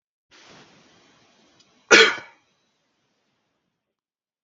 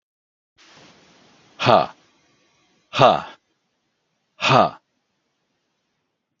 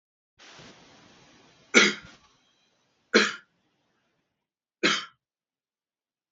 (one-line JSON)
{"cough_length": "4.4 s", "cough_amplitude": 32768, "cough_signal_mean_std_ratio": 0.18, "exhalation_length": "6.4 s", "exhalation_amplitude": 32768, "exhalation_signal_mean_std_ratio": 0.25, "three_cough_length": "6.3 s", "three_cough_amplitude": 24937, "three_cough_signal_mean_std_ratio": 0.23, "survey_phase": "beta (2021-08-13 to 2022-03-07)", "age": "45-64", "gender": "Male", "wearing_mask": "No", "symptom_none": true, "smoker_status": "Ex-smoker", "respiratory_condition_asthma": false, "respiratory_condition_other": false, "recruitment_source": "REACT", "submission_delay": "1 day", "covid_test_result": "Negative", "covid_test_method": "RT-qPCR", "influenza_a_test_result": "Negative", "influenza_b_test_result": "Negative"}